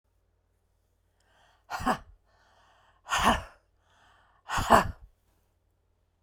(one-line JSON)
{"exhalation_length": "6.2 s", "exhalation_amplitude": 20408, "exhalation_signal_mean_std_ratio": 0.28, "survey_phase": "beta (2021-08-13 to 2022-03-07)", "age": "45-64", "gender": "Female", "wearing_mask": "No", "symptom_none": true, "smoker_status": "Ex-smoker", "respiratory_condition_asthma": false, "respiratory_condition_other": false, "recruitment_source": "REACT", "submission_delay": "2 days", "covid_test_result": "Negative", "covid_test_method": "RT-qPCR"}